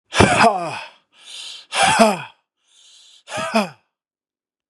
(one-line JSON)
{"exhalation_length": "4.7 s", "exhalation_amplitude": 32767, "exhalation_signal_mean_std_ratio": 0.42, "survey_phase": "beta (2021-08-13 to 2022-03-07)", "age": "18-44", "gender": "Male", "wearing_mask": "No", "symptom_none": true, "smoker_status": "Current smoker (1 to 10 cigarettes per day)", "respiratory_condition_asthma": false, "respiratory_condition_other": false, "recruitment_source": "REACT", "submission_delay": "1 day", "covid_test_result": "Negative", "covid_test_method": "RT-qPCR", "influenza_a_test_result": "Negative", "influenza_b_test_result": "Negative"}